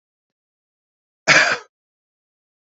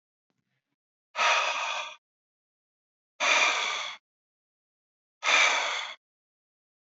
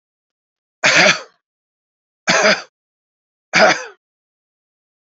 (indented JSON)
{
  "cough_length": "2.6 s",
  "cough_amplitude": 29149,
  "cough_signal_mean_std_ratio": 0.25,
  "exhalation_length": "6.8 s",
  "exhalation_amplitude": 9736,
  "exhalation_signal_mean_std_ratio": 0.43,
  "three_cough_length": "5.0 s",
  "three_cough_amplitude": 32767,
  "three_cough_signal_mean_std_ratio": 0.34,
  "survey_phase": "alpha (2021-03-01 to 2021-08-12)",
  "age": "45-64",
  "gender": "Male",
  "wearing_mask": "No",
  "symptom_none": true,
  "symptom_onset": "7 days",
  "smoker_status": "Never smoked",
  "respiratory_condition_asthma": false,
  "respiratory_condition_other": false,
  "recruitment_source": "REACT",
  "submission_delay": "2 days",
  "covid_test_result": "Negative",
  "covid_test_method": "RT-qPCR"
}